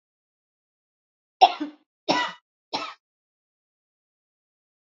{
  "three_cough_length": "4.9 s",
  "three_cough_amplitude": 27249,
  "three_cough_signal_mean_std_ratio": 0.2,
  "survey_phase": "beta (2021-08-13 to 2022-03-07)",
  "age": "18-44",
  "gender": "Female",
  "wearing_mask": "No",
  "symptom_runny_or_blocked_nose": true,
  "smoker_status": "Never smoked",
  "respiratory_condition_asthma": false,
  "respiratory_condition_other": false,
  "recruitment_source": "REACT",
  "submission_delay": "2 days",
  "covid_test_result": "Negative",
  "covid_test_method": "RT-qPCR",
  "influenza_a_test_result": "Negative",
  "influenza_b_test_result": "Negative"
}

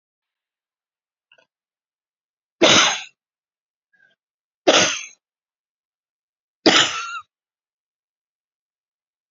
{
  "three_cough_length": "9.3 s",
  "three_cough_amplitude": 31917,
  "three_cough_signal_mean_std_ratio": 0.25,
  "survey_phase": "beta (2021-08-13 to 2022-03-07)",
  "age": "65+",
  "gender": "Female",
  "wearing_mask": "No",
  "symptom_cough_any": true,
  "symptom_runny_or_blocked_nose": true,
  "symptom_fatigue": true,
  "symptom_fever_high_temperature": true,
  "symptom_headache": true,
  "symptom_other": true,
  "smoker_status": "Never smoked",
  "respiratory_condition_asthma": false,
  "respiratory_condition_other": false,
  "recruitment_source": "Test and Trace",
  "submission_delay": "2 days",
  "covid_test_result": "Positive",
  "covid_test_method": "RT-qPCR",
  "covid_ct_value": 20.6,
  "covid_ct_gene": "ORF1ab gene"
}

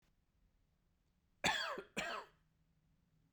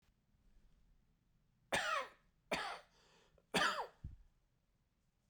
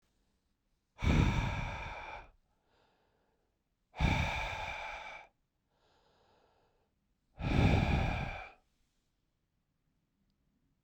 {
  "cough_length": "3.3 s",
  "cough_amplitude": 2811,
  "cough_signal_mean_std_ratio": 0.34,
  "three_cough_length": "5.3 s",
  "three_cough_amplitude": 2380,
  "three_cough_signal_mean_std_ratio": 0.35,
  "exhalation_length": "10.8 s",
  "exhalation_amplitude": 5266,
  "exhalation_signal_mean_std_ratio": 0.4,
  "survey_phase": "beta (2021-08-13 to 2022-03-07)",
  "age": "18-44",
  "gender": "Male",
  "wearing_mask": "No",
  "symptom_runny_or_blocked_nose": true,
  "symptom_fatigue": true,
  "symptom_headache": true,
  "symptom_onset": "10 days",
  "smoker_status": "Ex-smoker",
  "respiratory_condition_asthma": false,
  "respiratory_condition_other": false,
  "recruitment_source": "Test and Trace",
  "submission_delay": "2 days",
  "covid_test_result": "Positive",
  "covid_test_method": "RT-qPCR",
  "covid_ct_value": 21.4,
  "covid_ct_gene": "ORF1ab gene",
  "covid_ct_mean": 22.0,
  "covid_viral_load": "63000 copies/ml",
  "covid_viral_load_category": "Low viral load (10K-1M copies/ml)"
}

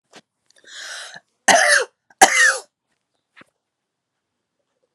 {
  "cough_length": "4.9 s",
  "cough_amplitude": 32768,
  "cough_signal_mean_std_ratio": 0.31,
  "survey_phase": "alpha (2021-03-01 to 2021-08-12)",
  "age": "18-44",
  "gender": "Female",
  "wearing_mask": "No",
  "symptom_none": true,
  "smoker_status": "Never smoked",
  "respiratory_condition_asthma": true,
  "respiratory_condition_other": false,
  "recruitment_source": "REACT",
  "submission_delay": "1 day",
  "covid_test_result": "Negative",
  "covid_test_method": "RT-qPCR"
}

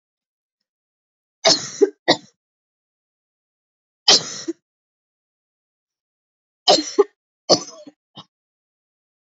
{
  "three_cough_length": "9.3 s",
  "three_cough_amplitude": 32768,
  "three_cough_signal_mean_std_ratio": 0.23,
  "survey_phase": "alpha (2021-03-01 to 2021-08-12)",
  "age": "18-44",
  "gender": "Female",
  "wearing_mask": "No",
  "symptom_cough_any": true,
  "symptom_fatigue": true,
  "symptom_headache": true,
  "symptom_change_to_sense_of_smell_or_taste": true,
  "symptom_onset": "3 days",
  "smoker_status": "Current smoker (e-cigarettes or vapes only)",
  "respiratory_condition_asthma": false,
  "respiratory_condition_other": false,
  "recruitment_source": "Test and Trace",
  "submission_delay": "2 days",
  "covid_test_result": "Positive",
  "covid_test_method": "RT-qPCR",
  "covid_ct_value": 16.4,
  "covid_ct_gene": "N gene",
  "covid_ct_mean": 16.6,
  "covid_viral_load": "3500000 copies/ml",
  "covid_viral_load_category": "High viral load (>1M copies/ml)"
}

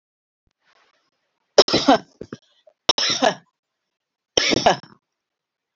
{
  "three_cough_length": "5.8 s",
  "three_cough_amplitude": 29406,
  "three_cough_signal_mean_std_ratio": 0.29,
  "survey_phase": "alpha (2021-03-01 to 2021-08-12)",
  "age": "45-64",
  "gender": "Female",
  "wearing_mask": "No",
  "symptom_none": true,
  "smoker_status": "Never smoked",
  "respiratory_condition_asthma": false,
  "respiratory_condition_other": false,
  "recruitment_source": "REACT",
  "submission_delay": "2 days",
  "covid_test_result": "Negative",
  "covid_test_method": "RT-qPCR"
}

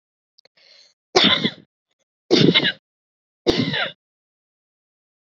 {
  "three_cough_length": "5.4 s",
  "three_cough_amplitude": 30755,
  "three_cough_signal_mean_std_ratio": 0.34,
  "survey_phase": "beta (2021-08-13 to 2022-03-07)",
  "age": "45-64",
  "gender": "Female",
  "wearing_mask": "No",
  "symptom_none": true,
  "smoker_status": "Never smoked",
  "respiratory_condition_asthma": true,
  "respiratory_condition_other": false,
  "recruitment_source": "REACT",
  "submission_delay": "1 day",
  "covid_test_result": "Negative",
  "covid_test_method": "RT-qPCR"
}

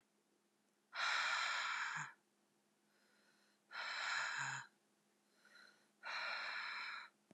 {
  "exhalation_length": "7.3 s",
  "exhalation_amplitude": 1399,
  "exhalation_signal_mean_std_ratio": 0.58,
  "survey_phase": "beta (2021-08-13 to 2022-03-07)",
  "age": "18-44",
  "gender": "Female",
  "wearing_mask": "No",
  "symptom_cough_any": true,
  "symptom_runny_or_blocked_nose": true,
  "symptom_shortness_of_breath": true,
  "symptom_sore_throat": true,
  "symptom_abdominal_pain": true,
  "symptom_fatigue": true,
  "symptom_fever_high_temperature": true,
  "symptom_headache": true,
  "smoker_status": "Never smoked",
  "respiratory_condition_asthma": false,
  "respiratory_condition_other": false,
  "recruitment_source": "Test and Trace",
  "submission_delay": "2 days",
  "covid_test_result": "Positive",
  "covid_test_method": "RT-qPCR",
  "covid_ct_value": 37.1,
  "covid_ct_gene": "ORF1ab gene"
}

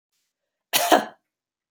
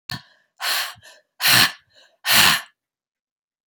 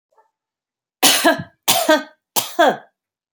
{
  "cough_length": "1.7 s",
  "cough_amplitude": 27585,
  "cough_signal_mean_std_ratio": 0.3,
  "exhalation_length": "3.7 s",
  "exhalation_amplitude": 32368,
  "exhalation_signal_mean_std_ratio": 0.39,
  "three_cough_length": "3.3 s",
  "three_cough_amplitude": 32768,
  "three_cough_signal_mean_std_ratio": 0.42,
  "survey_phase": "beta (2021-08-13 to 2022-03-07)",
  "age": "45-64",
  "gender": "Female",
  "wearing_mask": "No",
  "symptom_runny_or_blocked_nose": true,
  "symptom_sore_throat": true,
  "smoker_status": "Never smoked",
  "respiratory_condition_asthma": false,
  "respiratory_condition_other": false,
  "recruitment_source": "Test and Trace",
  "submission_delay": "0 days",
  "covid_test_result": "Positive",
  "covid_test_method": "LFT"
}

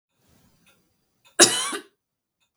{
  "cough_length": "2.6 s",
  "cough_amplitude": 32768,
  "cough_signal_mean_std_ratio": 0.23,
  "survey_phase": "beta (2021-08-13 to 2022-03-07)",
  "age": "18-44",
  "gender": "Female",
  "wearing_mask": "No",
  "symptom_sore_throat": true,
  "symptom_fatigue": true,
  "symptom_headache": true,
  "symptom_onset": "4 days",
  "smoker_status": "Ex-smoker",
  "respiratory_condition_asthma": true,
  "respiratory_condition_other": false,
  "recruitment_source": "Test and Trace",
  "submission_delay": "2 days",
  "covid_test_result": "Negative",
  "covid_test_method": "RT-qPCR"
}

